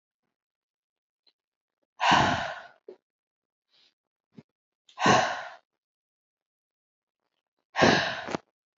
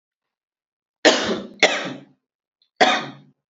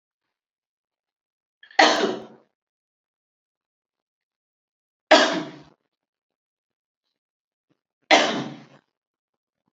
{"exhalation_length": "8.8 s", "exhalation_amplitude": 18007, "exhalation_signal_mean_std_ratio": 0.3, "cough_length": "3.5 s", "cough_amplitude": 30284, "cough_signal_mean_std_ratio": 0.35, "three_cough_length": "9.7 s", "three_cough_amplitude": 28597, "three_cough_signal_mean_std_ratio": 0.23, "survey_phase": "beta (2021-08-13 to 2022-03-07)", "age": "18-44", "gender": "Female", "wearing_mask": "No", "symptom_none": true, "smoker_status": "Never smoked", "respiratory_condition_asthma": false, "respiratory_condition_other": false, "recruitment_source": "REACT", "submission_delay": "3 days", "covid_test_result": "Negative", "covid_test_method": "RT-qPCR", "influenza_a_test_result": "Negative", "influenza_b_test_result": "Negative"}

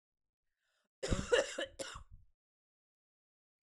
{"cough_length": "3.7 s", "cough_amplitude": 4798, "cough_signal_mean_std_ratio": 0.29, "survey_phase": "beta (2021-08-13 to 2022-03-07)", "age": "18-44", "gender": "Female", "wearing_mask": "No", "symptom_fatigue": true, "symptom_headache": true, "symptom_change_to_sense_of_smell_or_taste": true, "symptom_loss_of_taste": true, "symptom_other": true, "symptom_onset": "5 days", "smoker_status": "Never smoked", "respiratory_condition_asthma": false, "respiratory_condition_other": false, "recruitment_source": "Test and Trace", "submission_delay": "2 days", "covid_test_result": "Positive", "covid_test_method": "RT-qPCR", "covid_ct_value": 13.4, "covid_ct_gene": "N gene", "covid_ct_mean": 13.8, "covid_viral_load": "30000000 copies/ml", "covid_viral_load_category": "High viral load (>1M copies/ml)"}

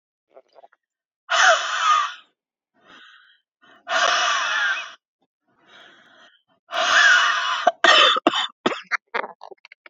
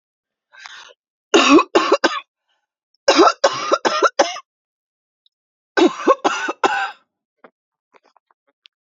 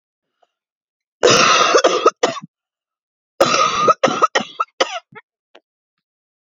{"exhalation_length": "9.9 s", "exhalation_amplitude": 28537, "exhalation_signal_mean_std_ratio": 0.47, "three_cough_length": "9.0 s", "three_cough_amplitude": 32767, "three_cough_signal_mean_std_ratio": 0.38, "cough_length": "6.5 s", "cough_amplitude": 30517, "cough_signal_mean_std_ratio": 0.43, "survey_phase": "beta (2021-08-13 to 2022-03-07)", "age": "18-44", "gender": "Female", "wearing_mask": "No", "symptom_cough_any": true, "symptom_runny_or_blocked_nose": true, "symptom_sore_throat": true, "symptom_onset": "6 days", "smoker_status": "Ex-smoker", "respiratory_condition_asthma": true, "respiratory_condition_other": false, "recruitment_source": "REACT", "submission_delay": "0 days", "covid_test_result": "Negative", "covid_test_method": "RT-qPCR"}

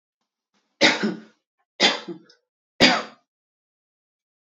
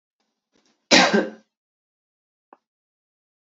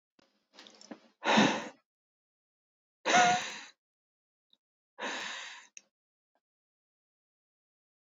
{"three_cough_length": "4.4 s", "three_cough_amplitude": 29269, "three_cough_signal_mean_std_ratio": 0.3, "cough_length": "3.6 s", "cough_amplitude": 30425, "cough_signal_mean_std_ratio": 0.23, "exhalation_length": "8.1 s", "exhalation_amplitude": 9394, "exhalation_signal_mean_std_ratio": 0.28, "survey_phase": "beta (2021-08-13 to 2022-03-07)", "age": "18-44", "gender": "Male", "wearing_mask": "No", "symptom_none": true, "smoker_status": "Never smoked", "respiratory_condition_asthma": false, "respiratory_condition_other": false, "recruitment_source": "REACT", "submission_delay": "1 day", "covid_test_result": "Negative", "covid_test_method": "RT-qPCR", "influenza_a_test_result": "Negative", "influenza_b_test_result": "Negative"}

